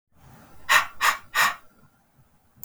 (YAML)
exhalation_length: 2.6 s
exhalation_amplitude: 20531
exhalation_signal_mean_std_ratio: 0.38
survey_phase: beta (2021-08-13 to 2022-03-07)
age: 45-64
gender: Female
wearing_mask: 'No'
symptom_none: true
smoker_status: Never smoked
respiratory_condition_asthma: false
respiratory_condition_other: false
recruitment_source: REACT
submission_delay: 3 days
covid_test_result: Negative
covid_test_method: RT-qPCR